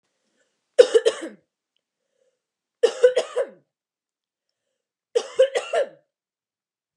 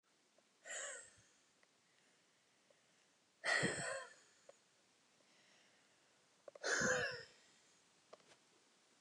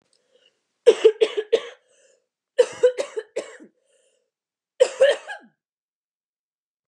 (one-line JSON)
{"three_cough_length": "7.0 s", "three_cough_amplitude": 29204, "three_cough_signal_mean_std_ratio": 0.27, "exhalation_length": "9.0 s", "exhalation_amplitude": 1914, "exhalation_signal_mean_std_ratio": 0.35, "cough_length": "6.9 s", "cough_amplitude": 28564, "cough_signal_mean_std_ratio": 0.28, "survey_phase": "beta (2021-08-13 to 2022-03-07)", "age": "18-44", "gender": "Female", "wearing_mask": "No", "symptom_none": true, "smoker_status": "Never smoked", "respiratory_condition_asthma": true, "respiratory_condition_other": false, "recruitment_source": "REACT", "submission_delay": "1 day", "covid_test_result": "Negative", "covid_test_method": "RT-qPCR", "influenza_a_test_result": "Negative", "influenza_b_test_result": "Negative"}